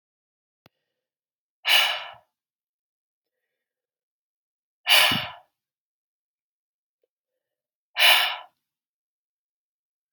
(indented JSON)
{
  "exhalation_length": "10.1 s",
  "exhalation_amplitude": 23744,
  "exhalation_signal_mean_std_ratio": 0.25,
  "survey_phase": "beta (2021-08-13 to 2022-03-07)",
  "age": "18-44",
  "gender": "Female",
  "wearing_mask": "No",
  "symptom_cough_any": true,
  "symptom_runny_or_blocked_nose": true,
  "symptom_fatigue": true,
  "symptom_headache": true,
  "symptom_change_to_sense_of_smell_or_taste": true,
  "symptom_loss_of_taste": true,
  "symptom_onset": "4 days",
  "smoker_status": "Never smoked",
  "respiratory_condition_asthma": false,
  "respiratory_condition_other": false,
  "recruitment_source": "Test and Trace",
  "submission_delay": "2 days",
  "covid_test_result": "Positive",
  "covid_test_method": "RT-qPCR",
  "covid_ct_value": 20.3,
  "covid_ct_gene": "ORF1ab gene",
  "covid_ct_mean": 21.3,
  "covid_viral_load": "100000 copies/ml",
  "covid_viral_load_category": "Low viral load (10K-1M copies/ml)"
}